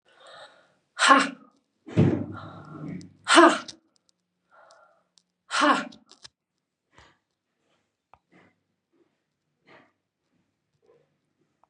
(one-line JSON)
{"exhalation_length": "11.7 s", "exhalation_amplitude": 26347, "exhalation_signal_mean_std_ratio": 0.25, "survey_phase": "beta (2021-08-13 to 2022-03-07)", "age": "45-64", "gender": "Female", "wearing_mask": "No", "symptom_cough_any": true, "symptom_runny_or_blocked_nose": true, "symptom_fatigue": true, "symptom_onset": "3 days", "smoker_status": "Never smoked", "respiratory_condition_asthma": false, "respiratory_condition_other": false, "recruitment_source": "Test and Trace", "submission_delay": "2 days", "covid_test_result": "Positive", "covid_test_method": "RT-qPCR", "covid_ct_value": 22.6, "covid_ct_gene": "ORF1ab gene", "covid_ct_mean": 22.9, "covid_viral_load": "32000 copies/ml", "covid_viral_load_category": "Low viral load (10K-1M copies/ml)"}